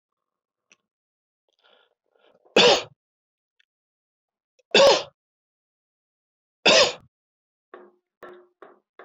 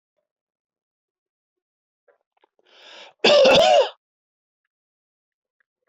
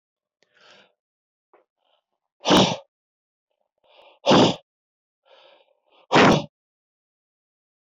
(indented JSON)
{
  "three_cough_length": "9.0 s",
  "three_cough_amplitude": 20953,
  "three_cough_signal_mean_std_ratio": 0.24,
  "cough_length": "5.9 s",
  "cough_amplitude": 20796,
  "cough_signal_mean_std_ratio": 0.29,
  "exhalation_length": "7.9 s",
  "exhalation_amplitude": 20473,
  "exhalation_signal_mean_std_ratio": 0.27,
  "survey_phase": "beta (2021-08-13 to 2022-03-07)",
  "age": "45-64",
  "gender": "Male",
  "wearing_mask": "No",
  "symptom_none": true,
  "smoker_status": "Never smoked",
  "respiratory_condition_asthma": false,
  "respiratory_condition_other": false,
  "recruitment_source": "REACT",
  "submission_delay": "0 days",
  "covid_test_result": "Negative",
  "covid_test_method": "RT-qPCR"
}